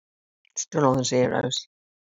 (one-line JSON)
{"exhalation_length": "2.1 s", "exhalation_amplitude": 17556, "exhalation_signal_mean_std_ratio": 0.51, "survey_phase": "beta (2021-08-13 to 2022-03-07)", "age": "65+", "gender": "Female", "wearing_mask": "No", "symptom_none": true, "smoker_status": "Ex-smoker", "respiratory_condition_asthma": false, "respiratory_condition_other": false, "recruitment_source": "REACT", "submission_delay": "2 days", "covid_test_result": "Negative", "covid_test_method": "RT-qPCR", "influenza_a_test_result": "Negative", "influenza_b_test_result": "Negative"}